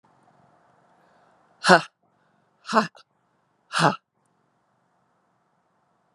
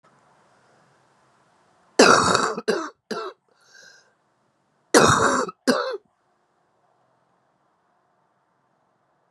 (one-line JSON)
{"exhalation_length": "6.1 s", "exhalation_amplitude": 32561, "exhalation_signal_mean_std_ratio": 0.2, "cough_length": "9.3 s", "cough_amplitude": 32729, "cough_signal_mean_std_ratio": 0.31, "survey_phase": "beta (2021-08-13 to 2022-03-07)", "age": "45-64", "gender": "Female", "wearing_mask": "No", "symptom_cough_any": true, "symptom_new_continuous_cough": true, "symptom_runny_or_blocked_nose": true, "symptom_shortness_of_breath": true, "symptom_sore_throat": true, "symptom_abdominal_pain": true, "symptom_diarrhoea": true, "symptom_fatigue": true, "symptom_fever_high_temperature": true, "symptom_headache": true, "symptom_change_to_sense_of_smell_or_taste": true, "symptom_other": true, "symptom_onset": "6 days", "smoker_status": "Ex-smoker", "respiratory_condition_asthma": false, "respiratory_condition_other": false, "recruitment_source": "Test and Trace", "submission_delay": "1 day", "covid_test_result": "Positive", "covid_test_method": "RT-qPCR"}